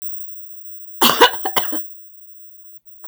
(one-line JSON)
{"cough_length": "3.1 s", "cough_amplitude": 32768, "cough_signal_mean_std_ratio": 0.75, "survey_phase": "beta (2021-08-13 to 2022-03-07)", "age": "45-64", "gender": "Female", "wearing_mask": "No", "symptom_none": true, "smoker_status": "Ex-smoker", "respiratory_condition_asthma": false, "respiratory_condition_other": false, "recruitment_source": "REACT", "submission_delay": "1 day", "covid_test_result": "Negative", "covid_test_method": "RT-qPCR", "influenza_a_test_result": "Negative", "influenza_b_test_result": "Negative"}